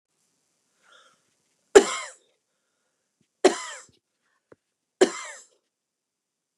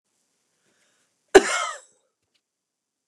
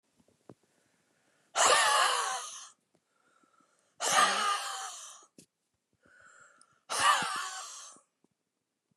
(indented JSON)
{
  "three_cough_length": "6.6 s",
  "three_cough_amplitude": 29203,
  "three_cough_signal_mean_std_ratio": 0.17,
  "cough_length": "3.1 s",
  "cough_amplitude": 29204,
  "cough_signal_mean_std_ratio": 0.18,
  "exhalation_length": "9.0 s",
  "exhalation_amplitude": 8682,
  "exhalation_signal_mean_std_ratio": 0.42,
  "survey_phase": "beta (2021-08-13 to 2022-03-07)",
  "age": "65+",
  "gender": "Female",
  "wearing_mask": "No",
  "symptom_none": true,
  "smoker_status": "Never smoked",
  "respiratory_condition_asthma": true,
  "respiratory_condition_other": false,
  "recruitment_source": "REACT",
  "submission_delay": "2 days",
  "covid_test_result": "Negative",
  "covid_test_method": "RT-qPCR",
  "influenza_a_test_result": "Negative",
  "influenza_b_test_result": "Negative"
}